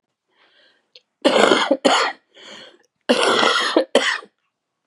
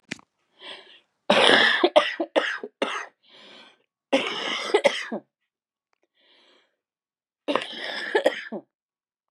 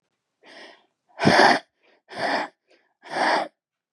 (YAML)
cough_length: 4.9 s
cough_amplitude: 32768
cough_signal_mean_std_ratio: 0.49
three_cough_length: 9.3 s
three_cough_amplitude: 29455
three_cough_signal_mean_std_ratio: 0.39
exhalation_length: 3.9 s
exhalation_amplitude: 22973
exhalation_signal_mean_std_ratio: 0.39
survey_phase: beta (2021-08-13 to 2022-03-07)
age: 18-44
gender: Female
wearing_mask: 'No'
symptom_cough_any: true
symptom_runny_or_blocked_nose: true
symptom_sore_throat: true
symptom_onset: 4 days
smoker_status: Current smoker (e-cigarettes or vapes only)
respiratory_condition_asthma: false
respiratory_condition_other: false
recruitment_source: REACT
submission_delay: 3 days
covid_test_result: Negative
covid_test_method: RT-qPCR
influenza_a_test_result: Negative
influenza_b_test_result: Negative